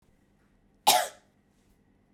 {
  "cough_length": "2.1 s",
  "cough_amplitude": 15105,
  "cough_signal_mean_std_ratio": 0.24,
  "survey_phase": "beta (2021-08-13 to 2022-03-07)",
  "age": "18-44",
  "gender": "Female",
  "wearing_mask": "No",
  "symptom_cough_any": true,
  "symptom_new_continuous_cough": true,
  "symptom_runny_or_blocked_nose": true,
  "symptom_other": true,
  "symptom_onset": "3 days",
  "smoker_status": "Never smoked",
  "respiratory_condition_asthma": true,
  "respiratory_condition_other": false,
  "recruitment_source": "Test and Trace",
  "submission_delay": "1 day",
  "covid_test_result": "Positive",
  "covid_test_method": "RT-qPCR",
  "covid_ct_value": 31.5,
  "covid_ct_gene": "N gene"
}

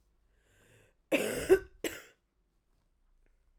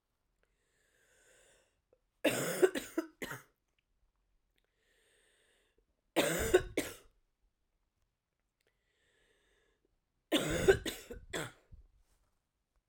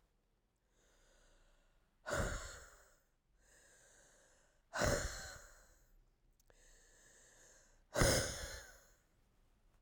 {
  "cough_length": "3.6 s",
  "cough_amplitude": 8070,
  "cough_signal_mean_std_ratio": 0.26,
  "three_cough_length": "12.9 s",
  "three_cough_amplitude": 8169,
  "three_cough_signal_mean_std_ratio": 0.28,
  "exhalation_length": "9.8 s",
  "exhalation_amplitude": 3796,
  "exhalation_signal_mean_std_ratio": 0.32,
  "survey_phase": "alpha (2021-03-01 to 2021-08-12)",
  "age": "45-64",
  "gender": "Female",
  "wearing_mask": "No",
  "symptom_new_continuous_cough": true,
  "symptom_fatigue": true,
  "symptom_fever_high_temperature": true,
  "symptom_headache": true,
  "symptom_change_to_sense_of_smell_or_taste": true,
  "symptom_onset": "3 days",
  "smoker_status": "Ex-smoker",
  "respiratory_condition_asthma": false,
  "respiratory_condition_other": false,
  "recruitment_source": "Test and Trace",
  "submission_delay": "1 day",
  "covid_test_result": "Positive",
  "covid_test_method": "RT-qPCR",
  "covid_ct_value": 17.3,
  "covid_ct_gene": "ORF1ab gene",
  "covid_ct_mean": 18.0,
  "covid_viral_load": "1300000 copies/ml",
  "covid_viral_load_category": "High viral load (>1M copies/ml)"
}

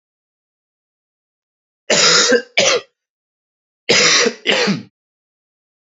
{
  "cough_length": "5.8 s",
  "cough_amplitude": 32095,
  "cough_signal_mean_std_ratio": 0.43,
  "survey_phase": "beta (2021-08-13 to 2022-03-07)",
  "age": "18-44",
  "gender": "Male",
  "wearing_mask": "No",
  "symptom_cough_any": true,
  "symptom_runny_or_blocked_nose": true,
  "symptom_sore_throat": true,
  "symptom_abdominal_pain": true,
  "symptom_fatigue": true,
  "symptom_change_to_sense_of_smell_or_taste": true,
  "smoker_status": "Never smoked",
  "respiratory_condition_asthma": true,
  "respiratory_condition_other": false,
  "recruitment_source": "Test and Trace",
  "submission_delay": "2 days",
  "covid_test_result": "Positive",
  "covid_test_method": "LFT"
}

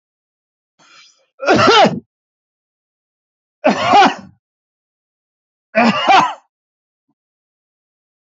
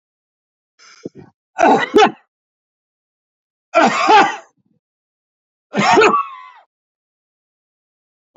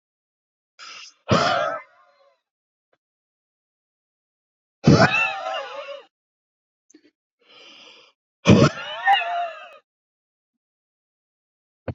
{
  "cough_length": "8.4 s",
  "cough_amplitude": 28911,
  "cough_signal_mean_std_ratio": 0.35,
  "three_cough_length": "8.4 s",
  "three_cough_amplitude": 30451,
  "three_cough_signal_mean_std_ratio": 0.35,
  "exhalation_length": "11.9 s",
  "exhalation_amplitude": 27590,
  "exhalation_signal_mean_std_ratio": 0.31,
  "survey_phase": "beta (2021-08-13 to 2022-03-07)",
  "age": "45-64",
  "gender": "Male",
  "wearing_mask": "No",
  "symptom_runny_or_blocked_nose": true,
  "smoker_status": "Ex-smoker",
  "respiratory_condition_asthma": false,
  "respiratory_condition_other": false,
  "recruitment_source": "REACT",
  "submission_delay": "1 day",
  "covid_test_result": "Negative",
  "covid_test_method": "RT-qPCR",
  "influenza_a_test_result": "Negative",
  "influenza_b_test_result": "Negative"
}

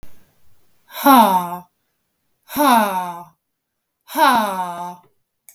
{
  "exhalation_length": "5.5 s",
  "exhalation_amplitude": 32766,
  "exhalation_signal_mean_std_ratio": 0.45,
  "survey_phase": "beta (2021-08-13 to 2022-03-07)",
  "age": "45-64",
  "gender": "Female",
  "wearing_mask": "No",
  "symptom_none": true,
  "smoker_status": "Never smoked",
  "respiratory_condition_asthma": false,
  "respiratory_condition_other": false,
  "recruitment_source": "REACT",
  "submission_delay": "1 day",
  "covid_test_result": "Negative",
  "covid_test_method": "RT-qPCR",
  "influenza_a_test_result": "Negative",
  "influenza_b_test_result": "Negative"
}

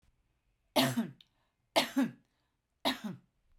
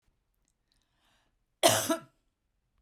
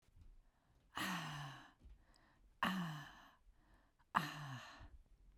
{
  "three_cough_length": "3.6 s",
  "three_cough_amplitude": 7067,
  "three_cough_signal_mean_std_ratio": 0.36,
  "cough_length": "2.8 s",
  "cough_amplitude": 18799,
  "cough_signal_mean_std_ratio": 0.25,
  "exhalation_length": "5.4 s",
  "exhalation_amplitude": 4699,
  "exhalation_signal_mean_std_ratio": 0.46,
  "survey_phase": "beta (2021-08-13 to 2022-03-07)",
  "age": "45-64",
  "gender": "Female",
  "wearing_mask": "No",
  "symptom_none": true,
  "smoker_status": "Never smoked",
  "respiratory_condition_asthma": false,
  "respiratory_condition_other": false,
  "recruitment_source": "REACT",
  "submission_delay": "1 day",
  "covid_test_result": "Negative",
  "covid_test_method": "RT-qPCR"
}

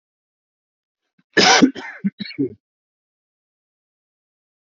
{
  "cough_length": "4.6 s",
  "cough_amplitude": 30178,
  "cough_signal_mean_std_ratio": 0.27,
  "survey_phase": "alpha (2021-03-01 to 2021-08-12)",
  "age": "45-64",
  "gender": "Male",
  "wearing_mask": "No",
  "symptom_none": true,
  "smoker_status": "Ex-smoker",
  "respiratory_condition_asthma": false,
  "respiratory_condition_other": false,
  "recruitment_source": "REACT",
  "submission_delay": "4 days",
  "covid_test_result": "Negative",
  "covid_test_method": "RT-qPCR"
}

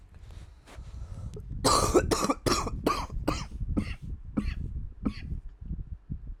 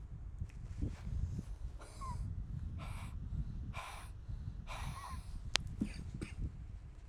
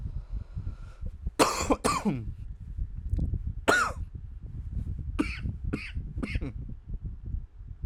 {
  "cough_length": "6.4 s",
  "cough_amplitude": 10948,
  "cough_signal_mean_std_ratio": 0.66,
  "exhalation_length": "7.1 s",
  "exhalation_amplitude": 15235,
  "exhalation_signal_mean_std_ratio": 0.96,
  "three_cough_length": "7.9 s",
  "three_cough_amplitude": 14962,
  "three_cough_signal_mean_std_ratio": 0.72,
  "survey_phase": "alpha (2021-03-01 to 2021-08-12)",
  "age": "18-44",
  "gender": "Male",
  "wearing_mask": "No",
  "symptom_cough_any": true,
  "symptom_fatigue": true,
  "symptom_fever_high_temperature": true,
  "symptom_headache": true,
  "symptom_change_to_sense_of_smell_or_taste": true,
  "symptom_onset": "3 days",
  "smoker_status": "Ex-smoker",
  "respiratory_condition_asthma": false,
  "respiratory_condition_other": false,
  "recruitment_source": "Test and Trace",
  "submission_delay": "1 day",
  "covid_test_result": "Positive",
  "covid_test_method": "RT-qPCR",
  "covid_ct_value": 15.9,
  "covid_ct_gene": "N gene",
  "covid_ct_mean": 16.0,
  "covid_viral_load": "5800000 copies/ml",
  "covid_viral_load_category": "High viral load (>1M copies/ml)"
}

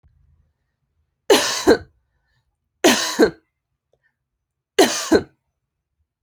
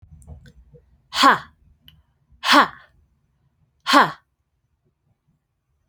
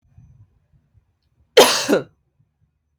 {
  "three_cough_length": "6.2 s",
  "three_cough_amplitude": 29551,
  "three_cough_signal_mean_std_ratio": 0.32,
  "exhalation_length": "5.9 s",
  "exhalation_amplitude": 32225,
  "exhalation_signal_mean_std_ratio": 0.27,
  "cough_length": "3.0 s",
  "cough_amplitude": 29465,
  "cough_signal_mean_std_ratio": 0.27,
  "survey_phase": "alpha (2021-03-01 to 2021-08-12)",
  "age": "18-44",
  "gender": "Female",
  "wearing_mask": "No",
  "symptom_shortness_of_breath": true,
  "symptom_loss_of_taste": true,
  "symptom_onset": "4 days",
  "smoker_status": "Never smoked",
  "respiratory_condition_asthma": false,
  "respiratory_condition_other": false,
  "recruitment_source": "Test and Trace",
  "submission_delay": "1 day",
  "covid_test_result": "Positive",
  "covid_test_method": "RT-qPCR",
  "covid_ct_value": 16.5,
  "covid_ct_gene": "ORF1ab gene",
  "covid_ct_mean": 17.0,
  "covid_viral_load": "2700000 copies/ml",
  "covid_viral_load_category": "High viral load (>1M copies/ml)"
}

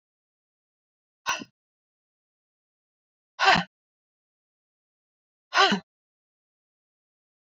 {
  "exhalation_length": "7.4 s",
  "exhalation_amplitude": 20089,
  "exhalation_signal_mean_std_ratio": 0.2,
  "survey_phase": "beta (2021-08-13 to 2022-03-07)",
  "age": "18-44",
  "gender": "Female",
  "wearing_mask": "No",
  "symptom_shortness_of_breath": true,
  "symptom_sore_throat": true,
  "symptom_diarrhoea": true,
  "symptom_fatigue": true,
  "smoker_status": "Never smoked",
  "respiratory_condition_asthma": false,
  "respiratory_condition_other": false,
  "recruitment_source": "Test and Trace",
  "submission_delay": "1 day",
  "covid_test_result": "Positive",
  "covid_test_method": "RT-qPCR",
  "covid_ct_value": 29.8,
  "covid_ct_gene": "ORF1ab gene",
  "covid_ct_mean": 30.7,
  "covid_viral_load": "84 copies/ml",
  "covid_viral_load_category": "Minimal viral load (< 10K copies/ml)"
}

